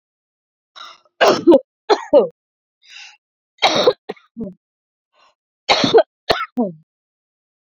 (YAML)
three_cough_length: 7.8 s
three_cough_amplitude: 29573
three_cough_signal_mean_std_ratio: 0.34
survey_phase: beta (2021-08-13 to 2022-03-07)
age: 18-44
gender: Female
wearing_mask: 'No'
symptom_none: true
smoker_status: Never smoked
respiratory_condition_asthma: false
respiratory_condition_other: false
recruitment_source: REACT
submission_delay: 4 days
covid_test_result: Negative
covid_test_method: RT-qPCR